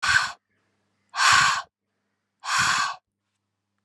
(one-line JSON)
{"exhalation_length": "3.8 s", "exhalation_amplitude": 18616, "exhalation_signal_mean_std_ratio": 0.45, "survey_phase": "alpha (2021-03-01 to 2021-08-12)", "age": "18-44", "gender": "Female", "wearing_mask": "No", "symptom_cough_any": true, "symptom_abdominal_pain": true, "smoker_status": "Never smoked", "respiratory_condition_asthma": false, "respiratory_condition_other": false, "recruitment_source": "Test and Trace", "submission_delay": "2 days", "covid_test_result": "Positive", "covid_test_method": "RT-qPCR"}